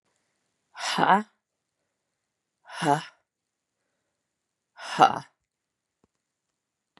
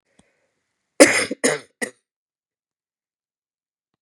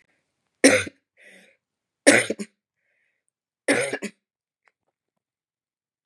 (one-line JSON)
{"exhalation_length": "7.0 s", "exhalation_amplitude": 29189, "exhalation_signal_mean_std_ratio": 0.23, "cough_length": "4.0 s", "cough_amplitude": 32768, "cough_signal_mean_std_ratio": 0.22, "three_cough_length": "6.1 s", "three_cough_amplitude": 32767, "three_cough_signal_mean_std_ratio": 0.24, "survey_phase": "beta (2021-08-13 to 2022-03-07)", "age": "45-64", "gender": "Female", "wearing_mask": "No", "symptom_cough_any": true, "symptom_sore_throat": true, "symptom_headache": true, "symptom_onset": "3 days", "smoker_status": "Never smoked", "respiratory_condition_asthma": false, "respiratory_condition_other": false, "recruitment_source": "Test and Trace", "submission_delay": "2 days", "covid_test_result": "Positive", "covid_test_method": "RT-qPCR", "covid_ct_value": 26.8, "covid_ct_gene": "ORF1ab gene", "covid_ct_mean": 27.4, "covid_viral_load": "1000 copies/ml", "covid_viral_load_category": "Minimal viral load (< 10K copies/ml)"}